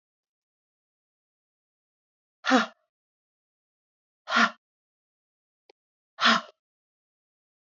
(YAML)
exhalation_length: 7.8 s
exhalation_amplitude: 14669
exhalation_signal_mean_std_ratio: 0.21
survey_phase: beta (2021-08-13 to 2022-03-07)
age: 18-44
gender: Female
wearing_mask: 'No'
symptom_change_to_sense_of_smell_or_taste: true
smoker_status: Current smoker (1 to 10 cigarettes per day)
respiratory_condition_asthma: false
respiratory_condition_other: false
recruitment_source: Test and Trace
submission_delay: 1 day
covid_test_result: Negative
covid_test_method: RT-qPCR